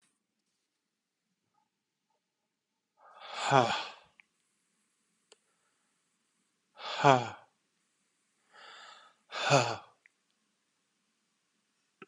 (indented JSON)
{
  "exhalation_length": "12.1 s",
  "exhalation_amplitude": 14054,
  "exhalation_signal_mean_std_ratio": 0.22,
  "survey_phase": "beta (2021-08-13 to 2022-03-07)",
  "age": "45-64",
  "gender": "Male",
  "wearing_mask": "No",
  "symptom_none": true,
  "smoker_status": "Never smoked",
  "respiratory_condition_asthma": false,
  "respiratory_condition_other": false,
  "recruitment_source": "REACT",
  "submission_delay": "4 days",
  "covid_test_result": "Negative",
  "covid_test_method": "RT-qPCR"
}